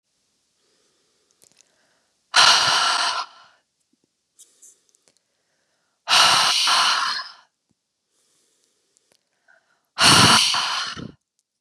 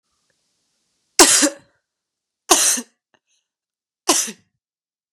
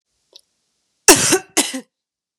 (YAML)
exhalation_length: 11.6 s
exhalation_amplitude: 30673
exhalation_signal_mean_std_ratio: 0.4
three_cough_length: 5.1 s
three_cough_amplitude: 32768
three_cough_signal_mean_std_ratio: 0.29
cough_length: 2.4 s
cough_amplitude: 32768
cough_signal_mean_std_ratio: 0.3
survey_phase: beta (2021-08-13 to 2022-03-07)
age: 18-44
gender: Female
wearing_mask: 'No'
symptom_cough_any: true
symptom_new_continuous_cough: true
symptom_runny_or_blocked_nose: true
symptom_sore_throat: true
symptom_fatigue: true
symptom_headache: true
symptom_onset: 3 days
smoker_status: Never smoked
respiratory_condition_asthma: false
respiratory_condition_other: false
recruitment_source: Test and Trace
submission_delay: 1 day
covid_test_result: Positive
covid_test_method: RT-qPCR
covid_ct_value: 26.2
covid_ct_gene: ORF1ab gene